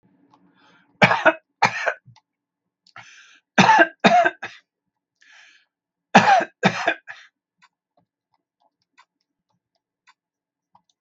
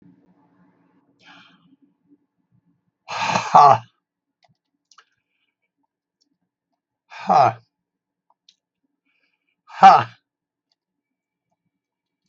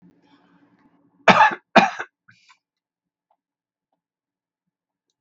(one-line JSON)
{"three_cough_length": "11.0 s", "three_cough_amplitude": 32768, "three_cough_signal_mean_std_ratio": 0.29, "exhalation_length": "12.3 s", "exhalation_amplitude": 32768, "exhalation_signal_mean_std_ratio": 0.21, "cough_length": "5.2 s", "cough_amplitude": 32768, "cough_signal_mean_std_ratio": 0.21, "survey_phase": "beta (2021-08-13 to 2022-03-07)", "age": "65+", "gender": "Male", "wearing_mask": "No", "symptom_none": true, "symptom_onset": "5 days", "smoker_status": "Ex-smoker", "respiratory_condition_asthma": false, "respiratory_condition_other": false, "recruitment_source": "REACT", "submission_delay": "3 days", "covid_test_result": "Negative", "covid_test_method": "RT-qPCR", "influenza_a_test_result": "Unknown/Void", "influenza_b_test_result": "Unknown/Void"}